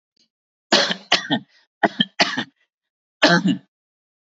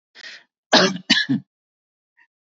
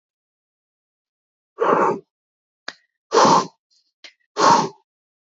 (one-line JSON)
{"three_cough_length": "4.3 s", "three_cough_amplitude": 29138, "three_cough_signal_mean_std_ratio": 0.38, "cough_length": "2.6 s", "cough_amplitude": 27941, "cough_signal_mean_std_ratio": 0.34, "exhalation_length": "5.2 s", "exhalation_amplitude": 25542, "exhalation_signal_mean_std_ratio": 0.35, "survey_phase": "beta (2021-08-13 to 2022-03-07)", "age": "45-64", "gender": "Male", "wearing_mask": "No", "symptom_none": true, "smoker_status": "Never smoked", "respiratory_condition_asthma": false, "respiratory_condition_other": false, "recruitment_source": "REACT", "submission_delay": "3 days", "covid_test_result": "Positive", "covid_test_method": "RT-qPCR", "covid_ct_value": 36.7, "covid_ct_gene": "E gene", "influenza_a_test_result": "Negative", "influenza_b_test_result": "Negative"}